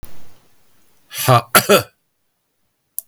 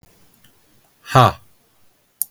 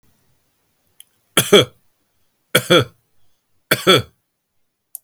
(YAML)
cough_length: 3.1 s
cough_amplitude: 32768
cough_signal_mean_std_ratio: 0.35
exhalation_length: 2.3 s
exhalation_amplitude: 32766
exhalation_signal_mean_std_ratio: 0.24
three_cough_length: 5.0 s
three_cough_amplitude: 32768
three_cough_signal_mean_std_ratio: 0.28
survey_phase: beta (2021-08-13 to 2022-03-07)
age: 45-64
gender: Male
wearing_mask: 'No'
symptom_none: true
smoker_status: Never smoked
respiratory_condition_asthma: false
respiratory_condition_other: false
recruitment_source: REACT
submission_delay: 3 days
covid_test_result: Negative
covid_test_method: RT-qPCR
influenza_a_test_result: Negative
influenza_b_test_result: Negative